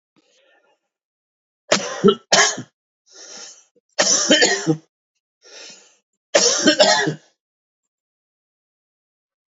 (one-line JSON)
{"three_cough_length": "9.6 s", "three_cough_amplitude": 32767, "three_cough_signal_mean_std_ratio": 0.36, "survey_phase": "beta (2021-08-13 to 2022-03-07)", "age": "45-64", "gender": "Male", "wearing_mask": "No", "symptom_cough_any": true, "symptom_new_continuous_cough": true, "symptom_shortness_of_breath": true, "symptom_fatigue": true, "symptom_change_to_sense_of_smell_or_taste": true, "smoker_status": "Never smoked", "respiratory_condition_asthma": false, "respiratory_condition_other": false, "recruitment_source": "Test and Trace", "submission_delay": "2 days", "covid_test_result": "Positive", "covid_test_method": "RT-qPCR", "covid_ct_value": 26.2, "covid_ct_gene": "ORF1ab gene", "covid_ct_mean": 27.1, "covid_viral_load": "1300 copies/ml", "covid_viral_load_category": "Minimal viral load (< 10K copies/ml)"}